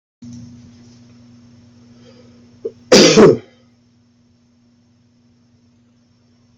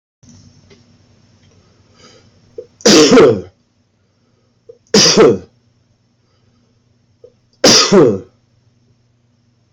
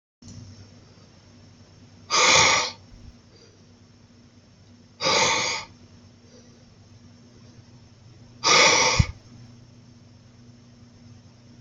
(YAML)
cough_length: 6.6 s
cough_amplitude: 32768
cough_signal_mean_std_ratio: 0.25
three_cough_length: 9.7 s
three_cough_amplitude: 32768
three_cough_signal_mean_std_ratio: 0.35
exhalation_length: 11.6 s
exhalation_amplitude: 22181
exhalation_signal_mean_std_ratio: 0.36
survey_phase: beta (2021-08-13 to 2022-03-07)
age: 18-44
gender: Male
wearing_mask: 'No'
symptom_cough_any: true
symptom_runny_or_blocked_nose: true
symptom_fatigue: true
symptom_headache: true
symptom_change_to_sense_of_smell_or_taste: true
smoker_status: Current smoker (e-cigarettes or vapes only)
respiratory_condition_asthma: false
respiratory_condition_other: false
recruitment_source: Test and Trace
submission_delay: 2 days
covid_test_result: Positive
covid_test_method: LFT